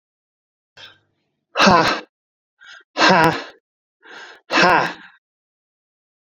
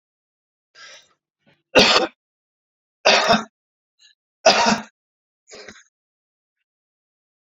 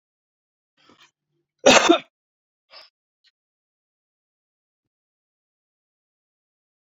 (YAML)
exhalation_length: 6.3 s
exhalation_amplitude: 28253
exhalation_signal_mean_std_ratio: 0.35
three_cough_length: 7.6 s
three_cough_amplitude: 32767
three_cough_signal_mean_std_ratio: 0.29
cough_length: 7.0 s
cough_amplitude: 29624
cough_signal_mean_std_ratio: 0.16
survey_phase: beta (2021-08-13 to 2022-03-07)
age: 65+
gender: Male
wearing_mask: 'No'
symptom_none: true
smoker_status: Ex-smoker
respiratory_condition_asthma: false
respiratory_condition_other: false
recruitment_source: REACT
submission_delay: 3 days
covid_test_result: Negative
covid_test_method: RT-qPCR
influenza_a_test_result: Negative
influenza_b_test_result: Negative